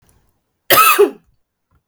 {
  "cough_length": "1.9 s",
  "cough_amplitude": 32768,
  "cough_signal_mean_std_ratio": 0.38,
  "survey_phase": "beta (2021-08-13 to 2022-03-07)",
  "age": "18-44",
  "gender": "Female",
  "wearing_mask": "No",
  "symptom_cough_any": true,
  "symptom_runny_or_blocked_nose": true,
  "symptom_sore_throat": true,
  "symptom_fatigue": true,
  "symptom_fever_high_temperature": true,
  "symptom_headache": true,
  "symptom_change_to_sense_of_smell_or_taste": true,
  "smoker_status": "Never smoked",
  "respiratory_condition_asthma": false,
  "respiratory_condition_other": false,
  "recruitment_source": "Test and Trace",
  "submission_delay": "1 day",
  "covid_test_result": "Positive",
  "covid_test_method": "RT-qPCR",
  "covid_ct_value": 21.7,
  "covid_ct_gene": "ORF1ab gene"
}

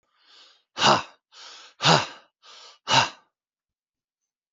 {
  "exhalation_length": "4.5 s",
  "exhalation_amplitude": 27456,
  "exhalation_signal_mean_std_ratio": 0.31,
  "survey_phase": "alpha (2021-03-01 to 2021-08-12)",
  "age": "45-64",
  "gender": "Male",
  "wearing_mask": "No",
  "symptom_none": true,
  "symptom_onset": "13 days",
  "smoker_status": "Never smoked",
  "respiratory_condition_asthma": false,
  "respiratory_condition_other": false,
  "recruitment_source": "REACT",
  "submission_delay": "3 days",
  "covid_test_result": "Negative",
  "covid_test_method": "RT-qPCR"
}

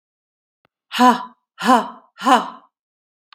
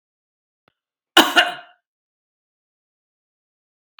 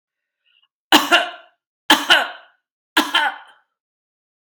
{
  "exhalation_length": "3.3 s",
  "exhalation_amplitude": 32767,
  "exhalation_signal_mean_std_ratio": 0.33,
  "cough_length": "4.0 s",
  "cough_amplitude": 32768,
  "cough_signal_mean_std_ratio": 0.19,
  "three_cough_length": "4.5 s",
  "three_cough_amplitude": 32768,
  "three_cough_signal_mean_std_ratio": 0.34,
  "survey_phase": "beta (2021-08-13 to 2022-03-07)",
  "age": "65+",
  "gender": "Female",
  "wearing_mask": "No",
  "symptom_cough_any": true,
  "symptom_runny_or_blocked_nose": true,
  "symptom_sore_throat": true,
  "symptom_fatigue": true,
  "symptom_loss_of_taste": true,
  "symptom_onset": "5 days",
  "smoker_status": "Never smoked",
  "respiratory_condition_asthma": false,
  "respiratory_condition_other": false,
  "recruitment_source": "Test and Trace",
  "submission_delay": "1 day",
  "covid_test_result": "Negative",
  "covid_test_method": "RT-qPCR"
}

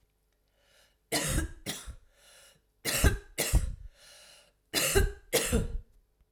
{
  "three_cough_length": "6.3 s",
  "three_cough_amplitude": 11127,
  "three_cough_signal_mean_std_ratio": 0.46,
  "survey_phase": "alpha (2021-03-01 to 2021-08-12)",
  "age": "45-64",
  "gender": "Female",
  "wearing_mask": "No",
  "symptom_diarrhoea": true,
  "symptom_fatigue": true,
  "symptom_headache": true,
  "smoker_status": "Never smoked",
  "respiratory_condition_asthma": false,
  "respiratory_condition_other": false,
  "recruitment_source": "Test and Trace",
  "submission_delay": "2 days",
  "covid_test_result": "Positive",
  "covid_test_method": "RT-qPCR"
}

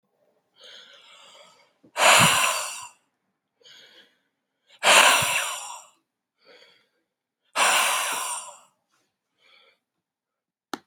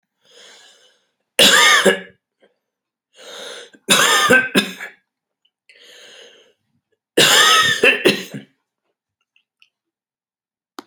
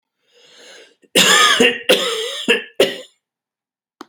{
  "exhalation_length": "10.9 s",
  "exhalation_amplitude": 27744,
  "exhalation_signal_mean_std_ratio": 0.35,
  "three_cough_length": "10.9 s",
  "three_cough_amplitude": 32768,
  "three_cough_signal_mean_std_ratio": 0.38,
  "cough_length": "4.1 s",
  "cough_amplitude": 32767,
  "cough_signal_mean_std_ratio": 0.47,
  "survey_phase": "beta (2021-08-13 to 2022-03-07)",
  "age": "65+",
  "gender": "Male",
  "wearing_mask": "No",
  "symptom_cough_any": true,
  "symptom_fatigue": true,
  "symptom_headache": true,
  "smoker_status": "Never smoked",
  "respiratory_condition_asthma": true,
  "respiratory_condition_other": false,
  "recruitment_source": "REACT",
  "submission_delay": "1 day",
  "covid_test_result": "Positive",
  "covid_test_method": "RT-qPCR",
  "covid_ct_value": 26.3,
  "covid_ct_gene": "E gene",
  "influenza_a_test_result": "Negative",
  "influenza_b_test_result": "Negative"
}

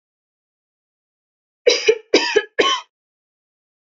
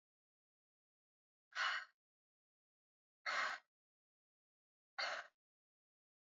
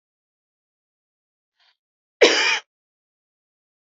{
  "three_cough_length": "3.8 s",
  "three_cough_amplitude": 29597,
  "three_cough_signal_mean_std_ratio": 0.32,
  "exhalation_length": "6.2 s",
  "exhalation_amplitude": 1347,
  "exhalation_signal_mean_std_ratio": 0.29,
  "cough_length": "3.9 s",
  "cough_amplitude": 30488,
  "cough_signal_mean_std_ratio": 0.22,
  "survey_phase": "beta (2021-08-13 to 2022-03-07)",
  "age": "18-44",
  "gender": "Female",
  "wearing_mask": "No",
  "symptom_none": true,
  "smoker_status": "Never smoked",
  "respiratory_condition_asthma": false,
  "respiratory_condition_other": false,
  "recruitment_source": "REACT",
  "submission_delay": "4 days",
  "covid_test_result": "Negative",
  "covid_test_method": "RT-qPCR",
  "influenza_a_test_result": "Negative",
  "influenza_b_test_result": "Negative"
}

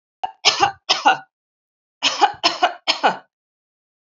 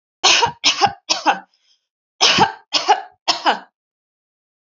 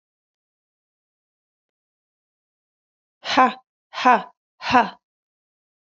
{
  "cough_length": "4.2 s",
  "cough_amplitude": 32768,
  "cough_signal_mean_std_ratio": 0.39,
  "three_cough_length": "4.6 s",
  "three_cough_amplitude": 32767,
  "three_cough_signal_mean_std_ratio": 0.44,
  "exhalation_length": "6.0 s",
  "exhalation_amplitude": 27962,
  "exhalation_signal_mean_std_ratio": 0.23,
  "survey_phase": "alpha (2021-03-01 to 2021-08-12)",
  "age": "45-64",
  "gender": "Female",
  "wearing_mask": "No",
  "symptom_none": true,
  "smoker_status": "Ex-smoker",
  "respiratory_condition_asthma": false,
  "respiratory_condition_other": false,
  "recruitment_source": "REACT",
  "submission_delay": "1 day",
  "covid_test_result": "Negative",
  "covid_test_method": "RT-qPCR"
}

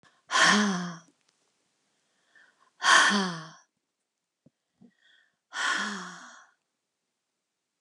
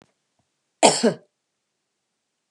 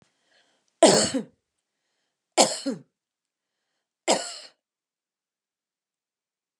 {
  "exhalation_length": "7.8 s",
  "exhalation_amplitude": 16143,
  "exhalation_signal_mean_std_ratio": 0.35,
  "cough_length": "2.5 s",
  "cough_amplitude": 31428,
  "cough_signal_mean_std_ratio": 0.23,
  "three_cough_length": "6.6 s",
  "three_cough_amplitude": 26425,
  "three_cough_signal_mean_std_ratio": 0.24,
  "survey_phase": "beta (2021-08-13 to 2022-03-07)",
  "age": "45-64",
  "gender": "Female",
  "wearing_mask": "No",
  "symptom_none": true,
  "smoker_status": "Never smoked",
  "respiratory_condition_asthma": false,
  "respiratory_condition_other": false,
  "recruitment_source": "REACT",
  "submission_delay": "2 days",
  "covid_test_result": "Negative",
  "covid_test_method": "RT-qPCR"
}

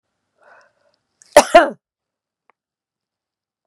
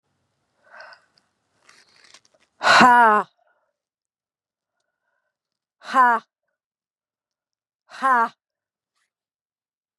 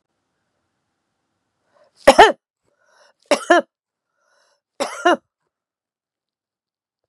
{
  "cough_length": "3.7 s",
  "cough_amplitude": 32768,
  "cough_signal_mean_std_ratio": 0.18,
  "exhalation_length": "10.0 s",
  "exhalation_amplitude": 31696,
  "exhalation_signal_mean_std_ratio": 0.26,
  "three_cough_length": "7.1 s",
  "three_cough_amplitude": 32768,
  "three_cough_signal_mean_std_ratio": 0.2,
  "survey_phase": "beta (2021-08-13 to 2022-03-07)",
  "age": "65+",
  "gender": "Female",
  "wearing_mask": "No",
  "symptom_cough_any": true,
  "symptom_shortness_of_breath": true,
  "symptom_fatigue": true,
  "symptom_headache": true,
  "symptom_onset": "3 days",
  "smoker_status": "Never smoked",
  "respiratory_condition_asthma": false,
  "respiratory_condition_other": false,
  "recruitment_source": "Test and Trace",
  "submission_delay": "2 days",
  "covid_test_result": "Positive",
  "covid_test_method": "ePCR"
}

